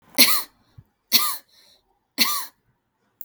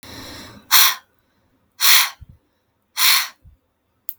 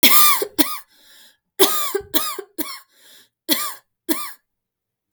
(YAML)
three_cough_length: 3.2 s
three_cough_amplitude: 32768
three_cough_signal_mean_std_ratio: 0.35
exhalation_length: 4.2 s
exhalation_amplitude: 32768
exhalation_signal_mean_std_ratio: 0.36
cough_length: 5.1 s
cough_amplitude: 32768
cough_signal_mean_std_ratio: 0.41
survey_phase: beta (2021-08-13 to 2022-03-07)
age: 18-44
gender: Female
wearing_mask: 'No'
symptom_cough_any: true
symptom_sore_throat: true
symptom_fatigue: true
symptom_onset: 3 days
smoker_status: Ex-smoker
respiratory_condition_asthma: true
respiratory_condition_other: false
recruitment_source: Test and Trace
submission_delay: 2 days
covid_test_result: Positive
covid_test_method: RT-qPCR
covid_ct_value: 24.5
covid_ct_gene: ORF1ab gene
covid_ct_mean: 24.8
covid_viral_load: 7500 copies/ml
covid_viral_load_category: Minimal viral load (< 10K copies/ml)